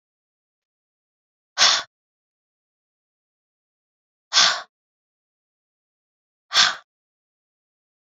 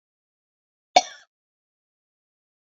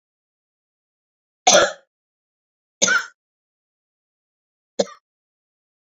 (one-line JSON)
{"exhalation_length": "8.0 s", "exhalation_amplitude": 28288, "exhalation_signal_mean_std_ratio": 0.22, "cough_length": "2.6 s", "cough_amplitude": 27682, "cough_signal_mean_std_ratio": 0.11, "three_cough_length": "5.9 s", "three_cough_amplitude": 29189, "three_cough_signal_mean_std_ratio": 0.22, "survey_phase": "beta (2021-08-13 to 2022-03-07)", "age": "45-64", "gender": "Female", "wearing_mask": "No", "symptom_cough_any": true, "symptom_sore_throat": true, "symptom_onset": "8 days", "smoker_status": "Never smoked", "respiratory_condition_asthma": false, "respiratory_condition_other": false, "recruitment_source": "REACT", "submission_delay": "2 days", "covid_test_result": "Negative", "covid_test_method": "RT-qPCR"}